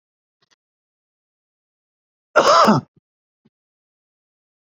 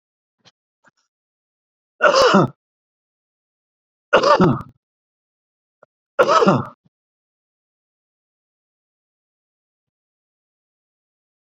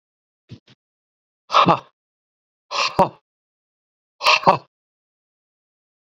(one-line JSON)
{"cough_length": "4.8 s", "cough_amplitude": 29565, "cough_signal_mean_std_ratio": 0.24, "three_cough_length": "11.5 s", "three_cough_amplitude": 29263, "three_cough_signal_mean_std_ratio": 0.27, "exhalation_length": "6.1 s", "exhalation_amplitude": 32768, "exhalation_signal_mean_std_ratio": 0.26, "survey_phase": "beta (2021-08-13 to 2022-03-07)", "age": "65+", "gender": "Male", "wearing_mask": "No", "symptom_none": true, "smoker_status": "Ex-smoker", "respiratory_condition_asthma": false, "respiratory_condition_other": false, "recruitment_source": "REACT", "submission_delay": "1 day", "covid_test_result": "Negative", "covid_test_method": "RT-qPCR"}